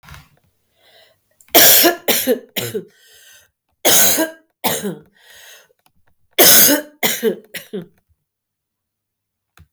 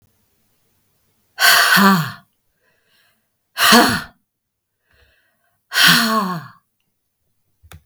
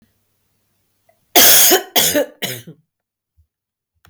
{"three_cough_length": "9.7 s", "three_cough_amplitude": 32768, "three_cough_signal_mean_std_ratio": 0.39, "exhalation_length": "7.9 s", "exhalation_amplitude": 32768, "exhalation_signal_mean_std_ratio": 0.38, "cough_length": "4.1 s", "cough_amplitude": 32768, "cough_signal_mean_std_ratio": 0.38, "survey_phase": "beta (2021-08-13 to 2022-03-07)", "age": "45-64", "gender": "Female", "wearing_mask": "No", "symptom_cough_any": true, "symptom_runny_or_blocked_nose": true, "symptom_shortness_of_breath": true, "symptom_abdominal_pain": true, "symptom_fatigue": true, "symptom_headache": true, "symptom_change_to_sense_of_smell_or_taste": true, "symptom_loss_of_taste": true, "symptom_onset": "3 days", "smoker_status": "Never smoked", "respiratory_condition_asthma": false, "respiratory_condition_other": false, "recruitment_source": "Test and Trace", "submission_delay": "2 days", "covid_test_result": "Positive", "covid_test_method": "RT-qPCR", "covid_ct_value": 19.1, "covid_ct_gene": "ORF1ab gene", "covid_ct_mean": 20.2, "covid_viral_load": "240000 copies/ml", "covid_viral_load_category": "Low viral load (10K-1M copies/ml)"}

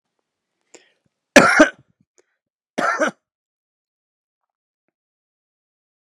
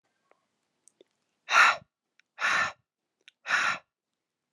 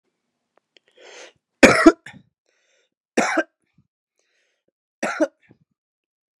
{"cough_length": "6.1 s", "cough_amplitude": 32768, "cough_signal_mean_std_ratio": 0.22, "exhalation_length": "4.5 s", "exhalation_amplitude": 14010, "exhalation_signal_mean_std_ratio": 0.32, "three_cough_length": "6.4 s", "three_cough_amplitude": 32768, "three_cough_signal_mean_std_ratio": 0.22, "survey_phase": "alpha (2021-03-01 to 2021-08-12)", "age": "18-44", "gender": "Male", "wearing_mask": "No", "symptom_cough_any": true, "smoker_status": "Current smoker (1 to 10 cigarettes per day)", "respiratory_condition_asthma": false, "respiratory_condition_other": false, "recruitment_source": "Test and Trace", "submission_delay": "1 day", "covid_test_result": "Positive", "covid_test_method": "RT-qPCR", "covid_ct_value": 18.5, "covid_ct_gene": "ORF1ab gene", "covid_ct_mean": 19.1, "covid_viral_load": "540000 copies/ml", "covid_viral_load_category": "Low viral load (10K-1M copies/ml)"}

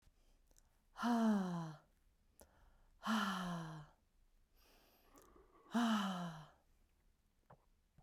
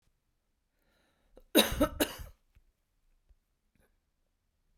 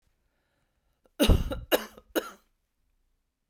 {"exhalation_length": "8.0 s", "exhalation_amplitude": 1649, "exhalation_signal_mean_std_ratio": 0.45, "cough_length": "4.8 s", "cough_amplitude": 11700, "cough_signal_mean_std_ratio": 0.22, "three_cough_length": "3.5 s", "three_cough_amplitude": 11665, "three_cough_signal_mean_std_ratio": 0.28, "survey_phase": "beta (2021-08-13 to 2022-03-07)", "age": "45-64", "gender": "Female", "wearing_mask": "No", "symptom_cough_any": true, "symptom_runny_or_blocked_nose": true, "symptom_shortness_of_breath": true, "symptom_sore_throat": true, "symptom_fatigue": true, "symptom_fever_high_temperature": true, "symptom_headache": true, "smoker_status": "Never smoked", "respiratory_condition_asthma": false, "respiratory_condition_other": false, "recruitment_source": "Test and Trace", "submission_delay": "2 days", "covid_test_result": "Positive", "covid_test_method": "RT-qPCR", "covid_ct_value": 26.5, "covid_ct_gene": "ORF1ab gene", "covid_ct_mean": 26.9, "covid_viral_load": "1500 copies/ml", "covid_viral_load_category": "Minimal viral load (< 10K copies/ml)"}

